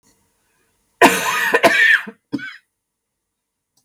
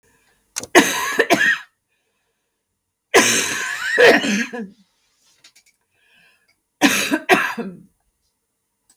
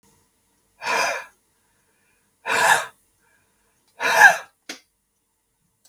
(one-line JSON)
{"cough_length": "3.8 s", "cough_amplitude": 32768, "cough_signal_mean_std_ratio": 0.4, "three_cough_length": "9.0 s", "three_cough_amplitude": 32768, "three_cough_signal_mean_std_ratio": 0.42, "exhalation_length": "5.9 s", "exhalation_amplitude": 32768, "exhalation_signal_mean_std_ratio": 0.3, "survey_phase": "beta (2021-08-13 to 2022-03-07)", "age": "45-64", "gender": "Female", "wearing_mask": "Yes", "symptom_cough_any": true, "symptom_runny_or_blocked_nose": true, "symptom_shortness_of_breath": true, "symptom_abdominal_pain": true, "symptom_fatigue": true, "symptom_fever_high_temperature": true, "symptom_headache": true, "symptom_other": true, "smoker_status": "Ex-smoker", "respiratory_condition_asthma": false, "respiratory_condition_other": false, "recruitment_source": "Test and Trace", "submission_delay": "0 days", "covid_test_result": "Positive", "covid_test_method": "LFT"}